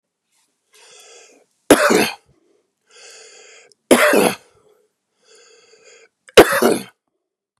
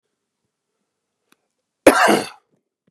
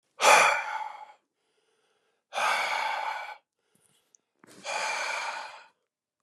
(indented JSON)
{
  "three_cough_length": "7.6 s",
  "three_cough_amplitude": 32768,
  "three_cough_signal_mean_std_ratio": 0.3,
  "cough_length": "2.9 s",
  "cough_amplitude": 32768,
  "cough_signal_mean_std_ratio": 0.26,
  "exhalation_length": "6.2 s",
  "exhalation_amplitude": 19028,
  "exhalation_signal_mean_std_ratio": 0.43,
  "survey_phase": "beta (2021-08-13 to 2022-03-07)",
  "age": "45-64",
  "gender": "Male",
  "wearing_mask": "No",
  "symptom_none": true,
  "smoker_status": "Never smoked",
  "respiratory_condition_asthma": false,
  "respiratory_condition_other": false,
  "recruitment_source": "REACT",
  "submission_delay": "2 days",
  "covid_test_result": "Negative",
  "covid_test_method": "RT-qPCR",
  "influenza_a_test_result": "Negative",
  "influenza_b_test_result": "Negative"
}